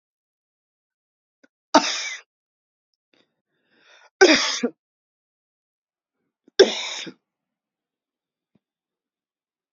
{
  "three_cough_length": "9.7 s",
  "three_cough_amplitude": 28595,
  "three_cough_signal_mean_std_ratio": 0.21,
  "survey_phase": "beta (2021-08-13 to 2022-03-07)",
  "age": "65+",
  "gender": "Female",
  "wearing_mask": "No",
  "symptom_runny_or_blocked_nose": true,
  "symptom_fatigue": true,
  "smoker_status": "Never smoked",
  "respiratory_condition_asthma": false,
  "respiratory_condition_other": false,
  "recruitment_source": "REACT",
  "submission_delay": "1 day",
  "covid_test_result": "Negative",
  "covid_test_method": "RT-qPCR"
}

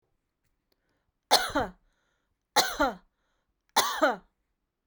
{
  "three_cough_length": "4.9 s",
  "three_cough_amplitude": 15783,
  "three_cough_signal_mean_std_ratio": 0.33,
  "survey_phase": "beta (2021-08-13 to 2022-03-07)",
  "age": "45-64",
  "gender": "Female",
  "wearing_mask": "No",
  "symptom_runny_or_blocked_nose": true,
  "symptom_onset": "12 days",
  "smoker_status": "Never smoked",
  "respiratory_condition_asthma": false,
  "respiratory_condition_other": false,
  "recruitment_source": "REACT",
  "submission_delay": "3 days",
  "covid_test_result": "Negative",
  "covid_test_method": "RT-qPCR"
}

